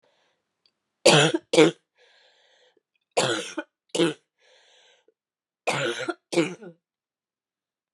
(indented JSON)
{
  "three_cough_length": "7.9 s",
  "three_cough_amplitude": 28533,
  "three_cough_signal_mean_std_ratio": 0.31,
  "survey_phase": "beta (2021-08-13 to 2022-03-07)",
  "age": "18-44",
  "gender": "Female",
  "wearing_mask": "No",
  "symptom_cough_any": true,
  "symptom_sore_throat": true,
  "symptom_abdominal_pain": true,
  "symptom_fatigue": true,
  "symptom_headache": true,
  "symptom_change_to_sense_of_smell_or_taste": true,
  "symptom_loss_of_taste": true,
  "symptom_other": true,
  "symptom_onset": "8 days",
  "smoker_status": "Ex-smoker",
  "respiratory_condition_asthma": false,
  "respiratory_condition_other": false,
  "recruitment_source": "Test and Trace",
  "submission_delay": "2 days",
  "covid_test_result": "Positive",
  "covid_test_method": "RT-qPCR"
}